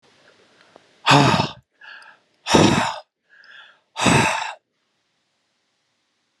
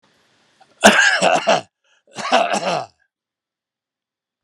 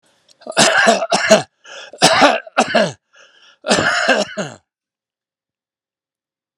exhalation_length: 6.4 s
exhalation_amplitude: 32608
exhalation_signal_mean_std_ratio: 0.37
cough_length: 4.4 s
cough_amplitude: 32768
cough_signal_mean_std_ratio: 0.41
three_cough_length: 6.6 s
three_cough_amplitude: 32768
three_cough_signal_mean_std_ratio: 0.46
survey_phase: alpha (2021-03-01 to 2021-08-12)
age: 65+
gender: Male
wearing_mask: 'No'
symptom_none: true
smoker_status: Never smoked
respiratory_condition_asthma: false
respiratory_condition_other: false
recruitment_source: REACT
submission_delay: 1 day
covid_test_result: Negative
covid_test_method: RT-qPCR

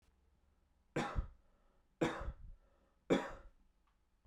three_cough_length: 4.3 s
three_cough_amplitude: 3082
three_cough_signal_mean_std_ratio: 0.35
survey_phase: beta (2021-08-13 to 2022-03-07)
age: 18-44
gender: Male
wearing_mask: 'No'
symptom_sore_throat: true
smoker_status: Never smoked
respiratory_condition_asthma: false
respiratory_condition_other: false
recruitment_source: REACT
submission_delay: 1 day
covid_test_result: Negative
covid_test_method: RT-qPCR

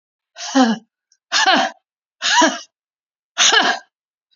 exhalation_length: 4.4 s
exhalation_amplitude: 30336
exhalation_signal_mean_std_ratio: 0.46
survey_phase: beta (2021-08-13 to 2022-03-07)
age: 65+
gender: Female
wearing_mask: 'No'
symptom_none: true
smoker_status: Never smoked
respiratory_condition_asthma: true
respiratory_condition_other: false
recruitment_source: REACT
submission_delay: 1 day
covid_test_result: Negative
covid_test_method: RT-qPCR
influenza_a_test_result: Negative
influenza_b_test_result: Negative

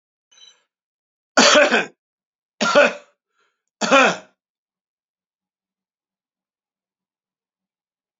three_cough_length: 8.2 s
three_cough_amplitude: 32768
three_cough_signal_mean_std_ratio: 0.28
survey_phase: beta (2021-08-13 to 2022-03-07)
age: 65+
gender: Male
wearing_mask: 'No'
symptom_none: true
smoker_status: Never smoked
respiratory_condition_asthma: false
respiratory_condition_other: false
recruitment_source: REACT
submission_delay: 1 day
covid_test_result: Negative
covid_test_method: RT-qPCR
influenza_a_test_result: Negative
influenza_b_test_result: Negative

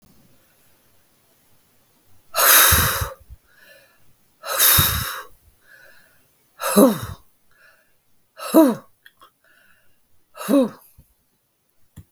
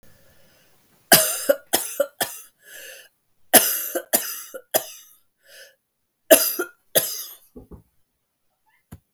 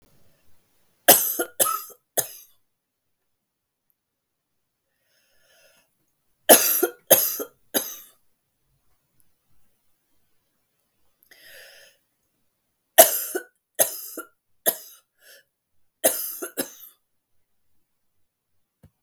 exhalation_length: 12.1 s
exhalation_amplitude: 32766
exhalation_signal_mean_std_ratio: 0.34
cough_length: 9.1 s
cough_amplitude: 32768
cough_signal_mean_std_ratio: 0.31
three_cough_length: 19.0 s
three_cough_amplitude: 32768
three_cough_signal_mean_std_ratio: 0.23
survey_phase: beta (2021-08-13 to 2022-03-07)
age: 45-64
gender: Female
wearing_mask: 'No'
symptom_new_continuous_cough: true
symptom_runny_or_blocked_nose: true
symptom_sore_throat: true
symptom_fatigue: true
symptom_headache: true
symptom_onset: 5 days
smoker_status: Never smoked
respiratory_condition_asthma: false
respiratory_condition_other: false
recruitment_source: REACT
submission_delay: 4 days
covid_test_result: Negative
covid_test_method: RT-qPCR
influenza_a_test_result: Negative
influenza_b_test_result: Negative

